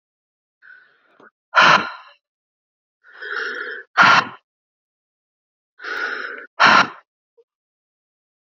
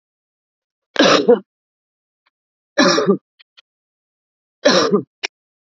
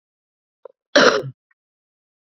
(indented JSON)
{
  "exhalation_length": "8.4 s",
  "exhalation_amplitude": 29999,
  "exhalation_signal_mean_std_ratio": 0.31,
  "three_cough_length": "5.7 s",
  "three_cough_amplitude": 29430,
  "three_cough_signal_mean_std_ratio": 0.35,
  "cough_length": "2.4 s",
  "cough_amplitude": 29478,
  "cough_signal_mean_std_ratio": 0.26,
  "survey_phase": "beta (2021-08-13 to 2022-03-07)",
  "age": "18-44",
  "gender": "Female",
  "wearing_mask": "No",
  "symptom_none": true,
  "smoker_status": "Current smoker (11 or more cigarettes per day)",
  "respiratory_condition_asthma": false,
  "respiratory_condition_other": false,
  "recruitment_source": "REACT",
  "submission_delay": "4 days",
  "covid_test_result": "Negative",
  "covid_test_method": "RT-qPCR",
  "influenza_a_test_result": "Negative",
  "influenza_b_test_result": "Negative"
}